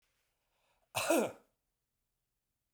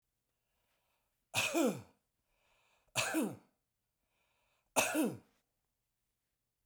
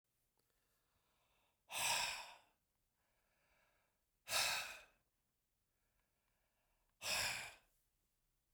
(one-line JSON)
{"cough_length": "2.7 s", "cough_amplitude": 4549, "cough_signal_mean_std_ratio": 0.28, "three_cough_length": "6.7 s", "three_cough_amplitude": 5802, "three_cough_signal_mean_std_ratio": 0.34, "exhalation_length": "8.5 s", "exhalation_amplitude": 1819, "exhalation_signal_mean_std_ratio": 0.34, "survey_phase": "beta (2021-08-13 to 2022-03-07)", "age": "45-64", "gender": "Male", "wearing_mask": "No", "symptom_none": true, "smoker_status": "Never smoked", "respiratory_condition_asthma": false, "respiratory_condition_other": false, "recruitment_source": "REACT", "submission_delay": "0 days", "covid_test_result": "Negative", "covid_test_method": "RT-qPCR"}